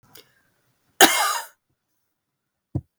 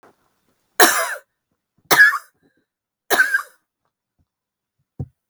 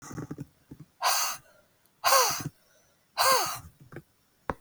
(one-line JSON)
{"cough_length": "3.0 s", "cough_amplitude": 32768, "cough_signal_mean_std_ratio": 0.25, "three_cough_length": "5.3 s", "three_cough_amplitude": 32768, "three_cough_signal_mean_std_ratio": 0.3, "exhalation_length": "4.6 s", "exhalation_amplitude": 12264, "exhalation_signal_mean_std_ratio": 0.43, "survey_phase": "beta (2021-08-13 to 2022-03-07)", "age": "45-64", "gender": "Female", "wearing_mask": "No", "symptom_cough_any": true, "symptom_runny_or_blocked_nose": true, "smoker_status": "Never smoked", "respiratory_condition_asthma": false, "respiratory_condition_other": false, "recruitment_source": "Test and Trace", "submission_delay": "2 days", "covid_test_result": "Positive", "covid_test_method": "LFT"}